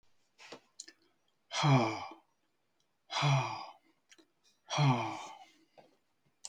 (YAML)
exhalation_length: 6.5 s
exhalation_amplitude: 5847
exhalation_signal_mean_std_ratio: 0.39
survey_phase: beta (2021-08-13 to 2022-03-07)
age: 65+
gender: Male
wearing_mask: 'No'
symptom_none: true
symptom_onset: 6 days
smoker_status: Never smoked
respiratory_condition_asthma: true
respiratory_condition_other: false
recruitment_source: REACT
submission_delay: 3 days
covid_test_result: Negative
covid_test_method: RT-qPCR
influenza_a_test_result: Unknown/Void
influenza_b_test_result: Unknown/Void